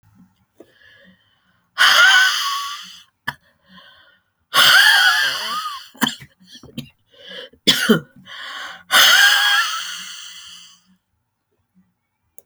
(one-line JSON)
{"exhalation_length": "12.5 s", "exhalation_amplitude": 32768, "exhalation_signal_mean_std_ratio": 0.44, "survey_phase": "alpha (2021-03-01 to 2021-08-12)", "age": "65+", "gender": "Female", "wearing_mask": "No", "symptom_none": true, "smoker_status": "Never smoked", "respiratory_condition_asthma": false, "respiratory_condition_other": false, "recruitment_source": "REACT", "submission_delay": "2 days", "covid_test_result": "Negative", "covid_test_method": "RT-qPCR"}